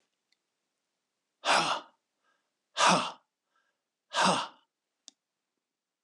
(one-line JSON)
{"exhalation_length": "6.0 s", "exhalation_amplitude": 9880, "exhalation_signal_mean_std_ratio": 0.31, "survey_phase": "beta (2021-08-13 to 2022-03-07)", "age": "65+", "gender": "Male", "wearing_mask": "No", "symptom_none": true, "smoker_status": "Ex-smoker", "respiratory_condition_asthma": false, "respiratory_condition_other": false, "recruitment_source": "REACT", "submission_delay": "1 day", "covid_test_result": "Negative", "covid_test_method": "RT-qPCR"}